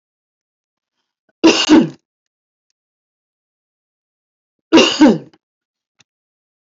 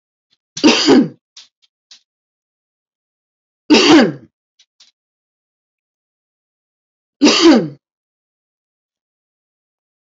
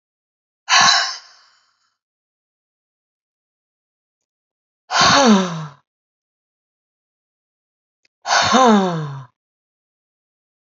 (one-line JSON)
{"cough_length": "6.7 s", "cough_amplitude": 29764, "cough_signal_mean_std_ratio": 0.28, "three_cough_length": "10.1 s", "three_cough_amplitude": 32200, "three_cough_signal_mean_std_ratio": 0.3, "exhalation_length": "10.8 s", "exhalation_amplitude": 30486, "exhalation_signal_mean_std_ratio": 0.33, "survey_phase": "alpha (2021-03-01 to 2021-08-12)", "age": "65+", "gender": "Female", "wearing_mask": "No", "symptom_none": true, "smoker_status": "Ex-smoker", "respiratory_condition_asthma": false, "respiratory_condition_other": false, "recruitment_source": "REACT", "submission_delay": "1 day", "covid_test_result": "Negative", "covid_test_method": "RT-qPCR"}